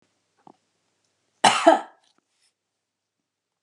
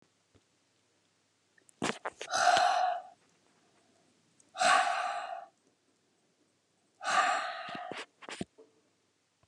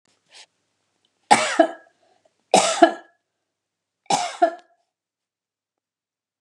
{"cough_length": "3.6 s", "cough_amplitude": 28985, "cough_signal_mean_std_ratio": 0.21, "exhalation_length": "9.5 s", "exhalation_amplitude": 12440, "exhalation_signal_mean_std_ratio": 0.4, "three_cough_length": "6.4 s", "three_cough_amplitude": 32768, "three_cough_signal_mean_std_ratio": 0.27, "survey_phase": "beta (2021-08-13 to 2022-03-07)", "age": "65+", "gender": "Female", "wearing_mask": "No", "symptom_none": true, "symptom_onset": "12 days", "smoker_status": "Ex-smoker", "respiratory_condition_asthma": false, "respiratory_condition_other": false, "recruitment_source": "REACT", "submission_delay": "3 days", "covid_test_result": "Negative", "covid_test_method": "RT-qPCR", "influenza_a_test_result": "Negative", "influenza_b_test_result": "Negative"}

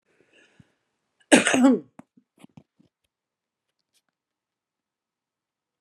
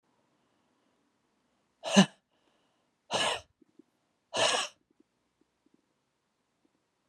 {"cough_length": "5.8 s", "cough_amplitude": 31385, "cough_signal_mean_std_ratio": 0.22, "exhalation_length": "7.1 s", "exhalation_amplitude": 17046, "exhalation_signal_mean_std_ratio": 0.23, "survey_phase": "beta (2021-08-13 to 2022-03-07)", "age": "45-64", "gender": "Female", "wearing_mask": "No", "symptom_none": true, "symptom_onset": "9 days", "smoker_status": "Current smoker (11 or more cigarettes per day)", "respiratory_condition_asthma": false, "respiratory_condition_other": false, "recruitment_source": "REACT", "submission_delay": "0 days", "covid_test_result": "Negative", "covid_test_method": "RT-qPCR"}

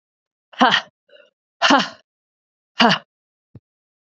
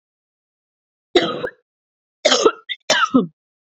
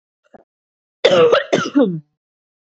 {"exhalation_length": "4.0 s", "exhalation_amplitude": 32768, "exhalation_signal_mean_std_ratio": 0.3, "three_cough_length": "3.8 s", "three_cough_amplitude": 28951, "three_cough_signal_mean_std_ratio": 0.36, "cough_length": "2.6 s", "cough_amplitude": 28411, "cough_signal_mean_std_ratio": 0.45, "survey_phase": "beta (2021-08-13 to 2022-03-07)", "age": "18-44", "gender": "Female", "wearing_mask": "No", "symptom_cough_any": true, "symptom_new_continuous_cough": true, "symptom_runny_or_blocked_nose": true, "symptom_sore_throat": true, "symptom_fever_high_temperature": true, "symptom_headache": true, "symptom_change_to_sense_of_smell_or_taste": true, "smoker_status": "Never smoked", "respiratory_condition_asthma": false, "respiratory_condition_other": false, "recruitment_source": "Test and Trace", "submission_delay": "3 days", "covid_test_result": "Positive", "covid_test_method": "RT-qPCR"}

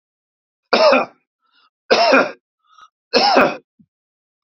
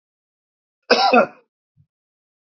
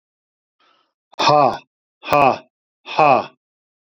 {"three_cough_length": "4.4 s", "three_cough_amplitude": 32675, "three_cough_signal_mean_std_ratio": 0.42, "cough_length": "2.6 s", "cough_amplitude": 29151, "cough_signal_mean_std_ratio": 0.29, "exhalation_length": "3.8 s", "exhalation_amplitude": 28847, "exhalation_signal_mean_std_ratio": 0.37, "survey_phase": "beta (2021-08-13 to 2022-03-07)", "age": "45-64", "gender": "Male", "wearing_mask": "No", "symptom_none": true, "smoker_status": "Ex-smoker", "respiratory_condition_asthma": true, "respiratory_condition_other": false, "recruitment_source": "REACT", "submission_delay": "1 day", "covid_test_result": "Negative", "covid_test_method": "RT-qPCR", "influenza_a_test_result": "Negative", "influenza_b_test_result": "Negative"}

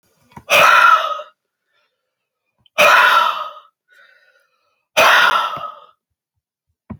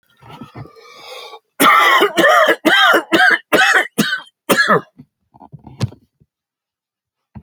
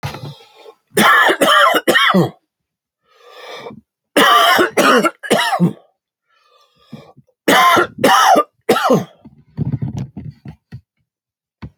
{"exhalation_length": "7.0 s", "exhalation_amplitude": 30808, "exhalation_signal_mean_std_ratio": 0.44, "cough_length": "7.4 s", "cough_amplitude": 32725, "cough_signal_mean_std_ratio": 0.51, "three_cough_length": "11.8 s", "three_cough_amplitude": 32768, "three_cough_signal_mean_std_ratio": 0.52, "survey_phase": "alpha (2021-03-01 to 2021-08-12)", "age": "45-64", "gender": "Male", "wearing_mask": "No", "symptom_none": true, "smoker_status": "Ex-smoker", "respiratory_condition_asthma": false, "respiratory_condition_other": false, "recruitment_source": "REACT", "submission_delay": "1 day", "covid_test_result": "Negative", "covid_test_method": "RT-qPCR"}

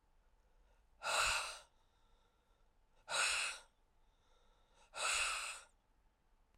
{"exhalation_length": "6.6 s", "exhalation_amplitude": 2270, "exhalation_signal_mean_std_ratio": 0.43, "survey_phase": "beta (2021-08-13 to 2022-03-07)", "age": "45-64", "gender": "Female", "wearing_mask": "No", "symptom_cough_any": true, "symptom_runny_or_blocked_nose": true, "symptom_sore_throat": true, "symptom_diarrhoea": true, "symptom_fatigue": true, "symptom_fever_high_temperature": true, "symptom_headache": true, "symptom_change_to_sense_of_smell_or_taste": true, "symptom_loss_of_taste": true, "symptom_onset": "5 days", "smoker_status": "Never smoked", "respiratory_condition_asthma": false, "respiratory_condition_other": false, "recruitment_source": "Test and Trace", "submission_delay": "4 days", "covid_test_result": "Positive", "covid_test_method": "RT-qPCR", "covid_ct_value": 23.4, "covid_ct_gene": "S gene", "covid_ct_mean": 23.8, "covid_viral_load": "16000 copies/ml", "covid_viral_load_category": "Low viral load (10K-1M copies/ml)"}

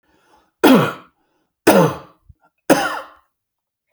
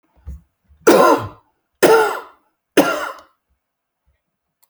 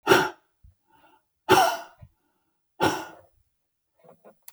{"cough_length": "3.9 s", "cough_amplitude": 32768, "cough_signal_mean_std_ratio": 0.36, "three_cough_length": "4.7 s", "three_cough_amplitude": 30621, "three_cough_signal_mean_std_ratio": 0.37, "exhalation_length": "4.5 s", "exhalation_amplitude": 20989, "exhalation_signal_mean_std_ratio": 0.3, "survey_phase": "beta (2021-08-13 to 2022-03-07)", "age": "65+", "gender": "Male", "wearing_mask": "No", "symptom_none": true, "smoker_status": "Ex-smoker", "respiratory_condition_asthma": false, "respiratory_condition_other": false, "recruitment_source": "REACT", "submission_delay": "1 day", "covid_test_result": "Negative", "covid_test_method": "RT-qPCR"}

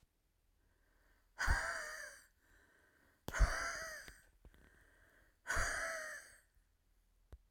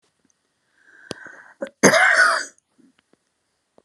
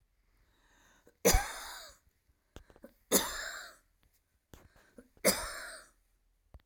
{"exhalation_length": "7.5 s", "exhalation_amplitude": 3343, "exhalation_signal_mean_std_ratio": 0.39, "cough_length": "3.8 s", "cough_amplitude": 31790, "cough_signal_mean_std_ratio": 0.33, "three_cough_length": "6.7 s", "three_cough_amplitude": 8446, "three_cough_signal_mean_std_ratio": 0.29, "survey_phase": "alpha (2021-03-01 to 2021-08-12)", "age": "65+", "gender": "Female", "wearing_mask": "No", "symptom_none": true, "smoker_status": "Ex-smoker", "respiratory_condition_asthma": false, "respiratory_condition_other": false, "recruitment_source": "REACT", "submission_delay": "2 days", "covid_test_result": "Negative", "covid_test_method": "RT-qPCR"}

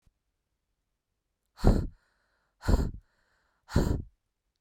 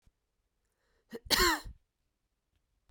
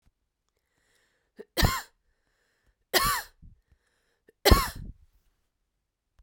{"exhalation_length": "4.6 s", "exhalation_amplitude": 12129, "exhalation_signal_mean_std_ratio": 0.3, "cough_length": "2.9 s", "cough_amplitude": 8897, "cough_signal_mean_std_ratio": 0.27, "three_cough_length": "6.2 s", "three_cough_amplitude": 20306, "three_cough_signal_mean_std_ratio": 0.25, "survey_phase": "beta (2021-08-13 to 2022-03-07)", "age": "18-44", "gender": "Female", "wearing_mask": "No", "symptom_none": true, "smoker_status": "Never smoked", "respiratory_condition_asthma": false, "respiratory_condition_other": false, "recruitment_source": "REACT", "submission_delay": "1 day", "covid_test_result": "Negative", "covid_test_method": "RT-qPCR", "influenza_a_test_result": "Unknown/Void", "influenza_b_test_result": "Unknown/Void"}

